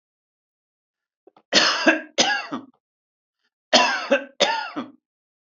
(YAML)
cough_length: 5.5 s
cough_amplitude: 29204
cough_signal_mean_std_ratio: 0.4
survey_phase: alpha (2021-03-01 to 2021-08-12)
age: 65+
gender: Male
wearing_mask: 'No'
symptom_none: true
smoker_status: Never smoked
respiratory_condition_asthma: false
respiratory_condition_other: false
recruitment_source: REACT
submission_delay: 1 day
covid_test_result: Negative
covid_test_method: RT-qPCR